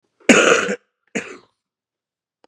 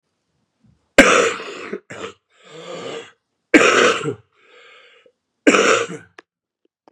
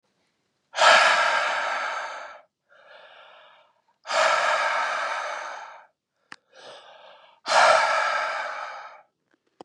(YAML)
cough_length: 2.5 s
cough_amplitude: 32767
cough_signal_mean_std_ratio: 0.34
three_cough_length: 6.9 s
three_cough_amplitude: 32768
three_cough_signal_mean_std_ratio: 0.37
exhalation_length: 9.6 s
exhalation_amplitude: 23170
exhalation_signal_mean_std_ratio: 0.51
survey_phase: beta (2021-08-13 to 2022-03-07)
age: 45-64
gender: Male
wearing_mask: 'No'
symptom_cough_any: true
symptom_new_continuous_cough: true
symptom_runny_or_blocked_nose: true
symptom_shortness_of_breath: true
symptom_sore_throat: true
symptom_fatigue: true
symptom_fever_high_temperature: true
symptom_headache: true
symptom_onset: 3 days
smoker_status: Current smoker (e-cigarettes or vapes only)
respiratory_condition_asthma: false
respiratory_condition_other: false
recruitment_source: Test and Trace
submission_delay: 2 days
covid_test_result: Positive
covid_test_method: RT-qPCR
covid_ct_value: 27.1
covid_ct_gene: ORF1ab gene
covid_ct_mean: 28.2
covid_viral_load: 570 copies/ml
covid_viral_load_category: Minimal viral load (< 10K copies/ml)